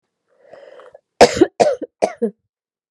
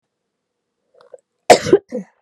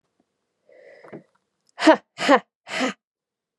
{"three_cough_length": "2.9 s", "three_cough_amplitude": 32768, "three_cough_signal_mean_std_ratio": 0.3, "cough_length": "2.2 s", "cough_amplitude": 32768, "cough_signal_mean_std_ratio": 0.24, "exhalation_length": "3.6 s", "exhalation_amplitude": 28611, "exhalation_signal_mean_std_ratio": 0.26, "survey_phase": "beta (2021-08-13 to 2022-03-07)", "age": "18-44", "gender": "Female", "wearing_mask": "No", "symptom_cough_any": true, "smoker_status": "Never smoked", "respiratory_condition_asthma": false, "respiratory_condition_other": false, "recruitment_source": "REACT", "submission_delay": "2 days", "covid_test_result": "Negative", "covid_test_method": "RT-qPCR"}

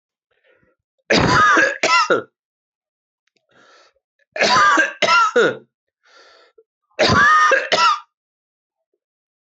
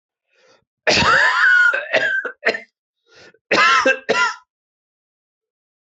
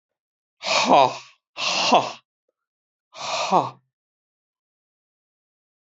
{"three_cough_length": "9.6 s", "three_cough_amplitude": 29157, "three_cough_signal_mean_std_ratio": 0.49, "cough_length": "5.8 s", "cough_amplitude": 26192, "cough_signal_mean_std_ratio": 0.53, "exhalation_length": "5.8 s", "exhalation_amplitude": 24402, "exhalation_signal_mean_std_ratio": 0.35, "survey_phase": "beta (2021-08-13 to 2022-03-07)", "age": "45-64", "gender": "Male", "wearing_mask": "No", "symptom_cough_any": true, "symptom_sore_throat": true, "symptom_fatigue": true, "symptom_headache": true, "smoker_status": "Ex-smoker", "respiratory_condition_asthma": false, "respiratory_condition_other": false, "recruitment_source": "Test and Trace", "submission_delay": "1 day", "covid_test_result": "Positive", "covid_test_method": "RT-qPCR", "covid_ct_value": 15.8, "covid_ct_gene": "ORF1ab gene", "covid_ct_mean": 16.0, "covid_viral_load": "5600000 copies/ml", "covid_viral_load_category": "High viral load (>1M copies/ml)"}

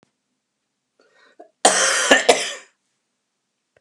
{"cough_length": "3.8 s", "cough_amplitude": 32768, "cough_signal_mean_std_ratio": 0.34, "survey_phase": "beta (2021-08-13 to 2022-03-07)", "age": "65+", "gender": "Male", "wearing_mask": "No", "symptom_none": true, "smoker_status": "Never smoked", "respiratory_condition_asthma": false, "respiratory_condition_other": false, "recruitment_source": "REACT", "submission_delay": "0 days", "covid_test_result": "Negative", "covid_test_method": "RT-qPCR"}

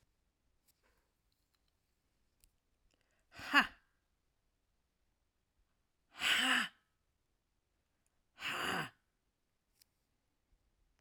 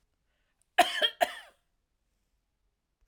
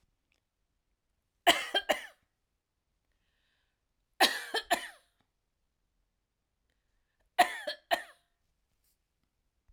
{"exhalation_length": "11.0 s", "exhalation_amplitude": 6391, "exhalation_signal_mean_std_ratio": 0.24, "cough_length": "3.1 s", "cough_amplitude": 13885, "cough_signal_mean_std_ratio": 0.24, "three_cough_length": "9.7 s", "three_cough_amplitude": 13410, "three_cough_signal_mean_std_ratio": 0.23, "survey_phase": "alpha (2021-03-01 to 2021-08-12)", "age": "65+", "gender": "Female", "wearing_mask": "No", "symptom_cough_any": true, "symptom_fatigue": true, "smoker_status": "Never smoked", "respiratory_condition_asthma": false, "respiratory_condition_other": false, "recruitment_source": "Test and Trace", "submission_delay": "2 days", "covid_test_result": "Positive", "covid_test_method": "RT-qPCR", "covid_ct_value": 29.8, "covid_ct_gene": "ORF1ab gene", "covid_ct_mean": 30.1, "covid_viral_load": "130 copies/ml", "covid_viral_load_category": "Minimal viral load (< 10K copies/ml)"}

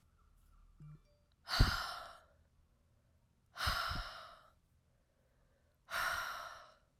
{"exhalation_length": "7.0 s", "exhalation_amplitude": 6238, "exhalation_signal_mean_std_ratio": 0.37, "survey_phase": "alpha (2021-03-01 to 2021-08-12)", "age": "18-44", "gender": "Female", "wearing_mask": "No", "symptom_cough_any": true, "symptom_shortness_of_breath": true, "symptom_fatigue": true, "symptom_fever_high_temperature": true, "symptom_headache": true, "symptom_change_to_sense_of_smell_or_taste": true, "symptom_onset": "3 days", "smoker_status": "Never smoked", "respiratory_condition_asthma": false, "respiratory_condition_other": false, "recruitment_source": "Test and Trace", "submission_delay": "2 days", "covid_test_result": "Positive", "covid_test_method": "RT-qPCR", "covid_ct_value": 26.0, "covid_ct_gene": "ORF1ab gene"}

